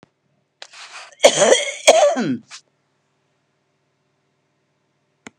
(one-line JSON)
{"cough_length": "5.4 s", "cough_amplitude": 32768, "cough_signal_mean_std_ratio": 0.32, "survey_phase": "beta (2021-08-13 to 2022-03-07)", "age": "65+", "gender": "Female", "wearing_mask": "No", "symptom_none": true, "smoker_status": "Ex-smoker", "respiratory_condition_asthma": false, "respiratory_condition_other": false, "recruitment_source": "REACT", "submission_delay": "7 days", "covid_test_result": "Negative", "covid_test_method": "RT-qPCR", "influenza_a_test_result": "Negative", "influenza_b_test_result": "Negative"}